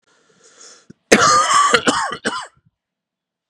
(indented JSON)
{
  "cough_length": "3.5 s",
  "cough_amplitude": 32768,
  "cough_signal_mean_std_ratio": 0.46,
  "survey_phase": "beta (2021-08-13 to 2022-03-07)",
  "age": "18-44",
  "gender": "Male",
  "wearing_mask": "No",
  "symptom_cough_any": true,
  "symptom_runny_or_blocked_nose": true,
  "symptom_shortness_of_breath": true,
  "symptom_fatigue": true,
  "symptom_headache": true,
  "symptom_change_to_sense_of_smell_or_taste": true,
  "symptom_loss_of_taste": true,
  "smoker_status": "Ex-smoker",
  "respiratory_condition_asthma": false,
  "respiratory_condition_other": false,
  "recruitment_source": "Test and Trace",
  "submission_delay": "2 days",
  "covid_test_result": "Positive",
  "covid_test_method": "LFT"
}